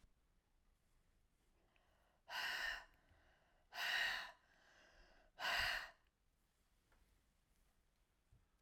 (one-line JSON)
{"exhalation_length": "8.6 s", "exhalation_amplitude": 1513, "exhalation_signal_mean_std_ratio": 0.37, "survey_phase": "alpha (2021-03-01 to 2021-08-12)", "age": "65+", "gender": "Female", "wearing_mask": "No", "symptom_none": true, "smoker_status": "Ex-smoker", "respiratory_condition_asthma": false, "respiratory_condition_other": false, "recruitment_source": "REACT", "submission_delay": "2 days", "covid_test_result": "Negative", "covid_test_method": "RT-qPCR"}